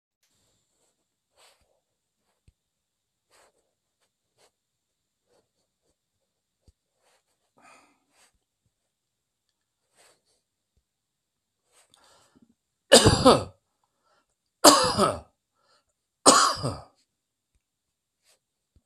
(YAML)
three_cough_length: 18.9 s
three_cough_amplitude: 32768
three_cough_signal_mean_std_ratio: 0.19
survey_phase: alpha (2021-03-01 to 2021-08-12)
age: 65+
gender: Male
wearing_mask: 'No'
symptom_none: true
smoker_status: Never smoked
respiratory_condition_asthma: false
respiratory_condition_other: false
recruitment_source: REACT
submission_delay: 1 day
covid_test_result: Negative
covid_test_method: RT-qPCR